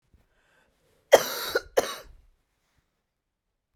{"cough_length": "3.8 s", "cough_amplitude": 29587, "cough_signal_mean_std_ratio": 0.21, "survey_phase": "beta (2021-08-13 to 2022-03-07)", "age": "45-64", "gender": "Female", "wearing_mask": "No", "symptom_cough_any": true, "symptom_fatigue": true, "symptom_fever_high_temperature": true, "symptom_loss_of_taste": true, "symptom_onset": "6 days", "smoker_status": "Ex-smoker", "respiratory_condition_asthma": false, "respiratory_condition_other": false, "recruitment_source": "Test and Trace", "submission_delay": "2 days", "covid_test_result": "Positive", "covid_test_method": "RT-qPCR", "covid_ct_value": 17.6, "covid_ct_gene": "ORF1ab gene", "covid_ct_mean": 18.2, "covid_viral_load": "1100000 copies/ml", "covid_viral_load_category": "High viral load (>1M copies/ml)"}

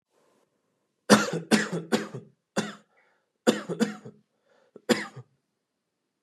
{"cough_length": "6.2 s", "cough_amplitude": 27993, "cough_signal_mean_std_ratio": 0.31, "survey_phase": "beta (2021-08-13 to 2022-03-07)", "age": "18-44", "gender": "Male", "wearing_mask": "No", "symptom_none": true, "smoker_status": "Ex-smoker", "recruitment_source": "Test and Trace", "submission_delay": "4 days", "covid_test_result": "Negative", "covid_test_method": "RT-qPCR"}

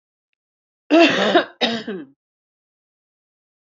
{"cough_length": "3.7 s", "cough_amplitude": 27869, "cough_signal_mean_std_ratio": 0.35, "survey_phase": "beta (2021-08-13 to 2022-03-07)", "age": "18-44", "gender": "Female", "wearing_mask": "No", "symptom_cough_any": true, "symptom_runny_or_blocked_nose": true, "symptom_shortness_of_breath": true, "symptom_fatigue": true, "symptom_headache": true, "symptom_change_to_sense_of_smell_or_taste": true, "symptom_loss_of_taste": true, "symptom_onset": "6 days", "smoker_status": "Ex-smoker", "respiratory_condition_asthma": false, "respiratory_condition_other": false, "recruitment_source": "Test and Trace", "submission_delay": "2 days", "covid_test_result": "Positive", "covid_test_method": "RT-qPCR"}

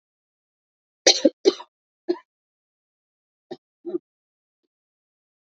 {"three_cough_length": "5.5 s", "three_cough_amplitude": 29576, "three_cough_signal_mean_std_ratio": 0.18, "survey_phase": "beta (2021-08-13 to 2022-03-07)", "age": "45-64", "gender": "Female", "wearing_mask": "No", "symptom_cough_any": true, "symptom_new_continuous_cough": true, "symptom_sore_throat": true, "symptom_abdominal_pain": true, "symptom_headache": true, "symptom_onset": "4 days", "smoker_status": "Never smoked", "respiratory_condition_asthma": false, "respiratory_condition_other": false, "recruitment_source": "Test and Trace", "submission_delay": "1 day", "covid_test_result": "Positive", "covid_test_method": "RT-qPCR"}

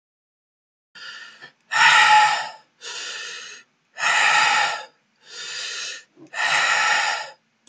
{"exhalation_length": "7.7 s", "exhalation_amplitude": 27983, "exhalation_signal_mean_std_ratio": 0.53, "survey_phase": "alpha (2021-03-01 to 2021-08-12)", "age": "18-44", "gender": "Male", "wearing_mask": "No", "symptom_cough_any": true, "symptom_onset": "2 days", "smoker_status": "Never smoked", "respiratory_condition_asthma": true, "respiratory_condition_other": false, "recruitment_source": "Test and Trace", "submission_delay": "1 day", "covid_test_result": "Positive", "covid_test_method": "RT-qPCR"}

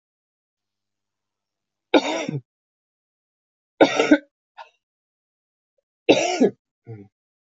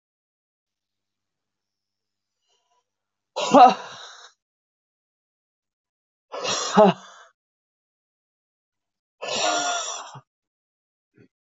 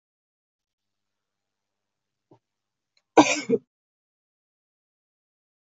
{"three_cough_length": "7.5 s", "three_cough_amplitude": 25642, "three_cough_signal_mean_std_ratio": 0.26, "exhalation_length": "11.4 s", "exhalation_amplitude": 24883, "exhalation_signal_mean_std_ratio": 0.24, "cough_length": "5.6 s", "cough_amplitude": 25300, "cough_signal_mean_std_ratio": 0.15, "survey_phase": "beta (2021-08-13 to 2022-03-07)", "age": "45-64", "gender": "Female", "wearing_mask": "No", "symptom_cough_any": true, "symptom_new_continuous_cough": true, "symptom_runny_or_blocked_nose": true, "symptom_shortness_of_breath": true, "symptom_sore_throat": true, "symptom_fatigue": true, "symptom_fever_high_temperature": true, "symptom_headache": true, "symptom_change_to_sense_of_smell_or_taste": true, "symptom_loss_of_taste": true, "symptom_other": true, "smoker_status": "Ex-smoker", "respiratory_condition_asthma": false, "respiratory_condition_other": false, "recruitment_source": "Test and Trace", "submission_delay": "2 days", "covid_test_result": "Positive", "covid_test_method": "RT-qPCR"}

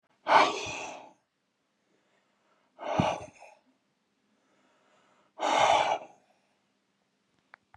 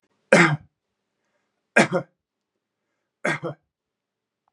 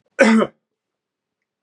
{"exhalation_length": "7.8 s", "exhalation_amplitude": 13770, "exhalation_signal_mean_std_ratio": 0.33, "three_cough_length": "4.5 s", "three_cough_amplitude": 28838, "three_cough_signal_mean_std_ratio": 0.26, "cough_length": "1.6 s", "cough_amplitude": 31465, "cough_signal_mean_std_ratio": 0.34, "survey_phase": "beta (2021-08-13 to 2022-03-07)", "age": "45-64", "gender": "Male", "wearing_mask": "No", "symptom_none": true, "smoker_status": "Ex-smoker", "respiratory_condition_asthma": false, "respiratory_condition_other": false, "recruitment_source": "REACT", "submission_delay": "0 days", "covid_test_result": "Negative", "covid_test_method": "RT-qPCR"}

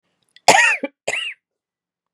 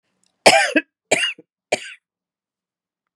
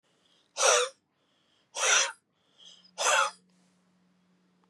{"cough_length": "2.1 s", "cough_amplitude": 32768, "cough_signal_mean_std_ratio": 0.36, "three_cough_length": "3.2 s", "three_cough_amplitude": 32768, "three_cough_signal_mean_std_ratio": 0.31, "exhalation_length": "4.7 s", "exhalation_amplitude": 12385, "exhalation_signal_mean_std_ratio": 0.37, "survey_phase": "beta (2021-08-13 to 2022-03-07)", "age": "45-64", "gender": "Female", "wearing_mask": "No", "symptom_none": true, "smoker_status": "Ex-smoker", "respiratory_condition_asthma": true, "respiratory_condition_other": false, "recruitment_source": "REACT", "submission_delay": "2 days", "covid_test_result": "Negative", "covid_test_method": "RT-qPCR", "influenza_a_test_result": "Negative", "influenza_b_test_result": "Negative"}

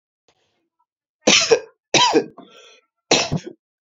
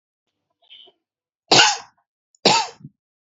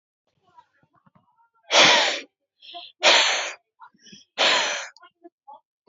{"three_cough_length": "3.9 s", "three_cough_amplitude": 32767, "three_cough_signal_mean_std_ratio": 0.37, "cough_length": "3.3 s", "cough_amplitude": 30533, "cough_signal_mean_std_ratio": 0.29, "exhalation_length": "5.9 s", "exhalation_amplitude": 24136, "exhalation_signal_mean_std_ratio": 0.38, "survey_phase": "beta (2021-08-13 to 2022-03-07)", "age": "18-44", "gender": "Male", "wearing_mask": "No", "symptom_none": true, "smoker_status": "Never smoked", "respiratory_condition_asthma": false, "respiratory_condition_other": false, "recruitment_source": "REACT", "submission_delay": "4 days", "covid_test_result": "Negative", "covid_test_method": "RT-qPCR", "influenza_a_test_result": "Unknown/Void", "influenza_b_test_result": "Unknown/Void"}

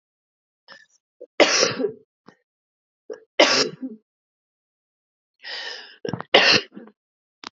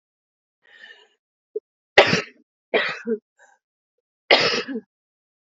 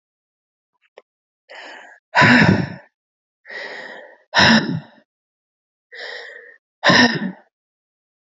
{"three_cough_length": "7.6 s", "three_cough_amplitude": 28555, "three_cough_signal_mean_std_ratio": 0.31, "cough_length": "5.5 s", "cough_amplitude": 32768, "cough_signal_mean_std_ratio": 0.29, "exhalation_length": "8.4 s", "exhalation_amplitude": 32513, "exhalation_signal_mean_std_ratio": 0.35, "survey_phase": "beta (2021-08-13 to 2022-03-07)", "age": "18-44", "gender": "Female", "wearing_mask": "No", "symptom_cough_any": true, "symptom_runny_or_blocked_nose": true, "symptom_shortness_of_breath": true, "symptom_sore_throat": true, "symptom_fatigue": true, "symptom_headache": true, "symptom_change_to_sense_of_smell_or_taste": true, "symptom_loss_of_taste": true, "symptom_onset": "3 days", "smoker_status": "Current smoker (e-cigarettes or vapes only)", "respiratory_condition_asthma": true, "respiratory_condition_other": false, "recruitment_source": "Test and Trace", "submission_delay": "1 day", "covid_test_result": "Positive", "covid_test_method": "RT-qPCR", "covid_ct_value": 12.4, "covid_ct_gene": "ORF1ab gene", "covid_ct_mean": 13.0, "covid_viral_load": "54000000 copies/ml", "covid_viral_load_category": "High viral load (>1M copies/ml)"}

